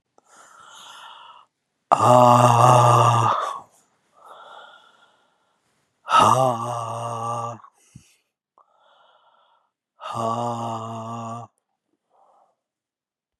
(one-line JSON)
{"exhalation_length": "13.4 s", "exhalation_amplitude": 32669, "exhalation_signal_mean_std_ratio": 0.39, "survey_phase": "beta (2021-08-13 to 2022-03-07)", "age": "45-64", "gender": "Male", "wearing_mask": "No", "symptom_cough_any": true, "symptom_new_continuous_cough": true, "symptom_runny_or_blocked_nose": true, "symptom_sore_throat": true, "symptom_fatigue": true, "symptom_fever_high_temperature": true, "symptom_headache": true, "symptom_onset": "5 days", "smoker_status": "Never smoked", "respiratory_condition_asthma": false, "respiratory_condition_other": false, "recruitment_source": "Test and Trace", "submission_delay": "2 days", "covid_test_result": "Positive", "covid_test_method": "RT-qPCR", "covid_ct_value": 22.1, "covid_ct_gene": "ORF1ab gene", "covid_ct_mean": 22.6, "covid_viral_load": "38000 copies/ml", "covid_viral_load_category": "Low viral load (10K-1M copies/ml)"}